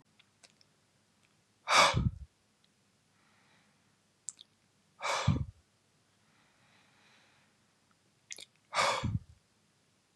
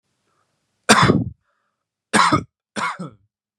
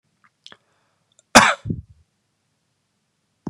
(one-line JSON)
{"exhalation_length": "10.2 s", "exhalation_amplitude": 10091, "exhalation_signal_mean_std_ratio": 0.28, "three_cough_length": "3.6 s", "three_cough_amplitude": 32767, "three_cough_signal_mean_std_ratio": 0.36, "cough_length": "3.5 s", "cough_amplitude": 32768, "cough_signal_mean_std_ratio": 0.19, "survey_phase": "beta (2021-08-13 to 2022-03-07)", "age": "18-44", "gender": "Male", "wearing_mask": "No", "symptom_none": true, "smoker_status": "Never smoked", "respiratory_condition_asthma": false, "respiratory_condition_other": false, "recruitment_source": "REACT", "submission_delay": "2 days", "covid_test_result": "Negative", "covid_test_method": "RT-qPCR", "influenza_a_test_result": "Negative", "influenza_b_test_result": "Negative"}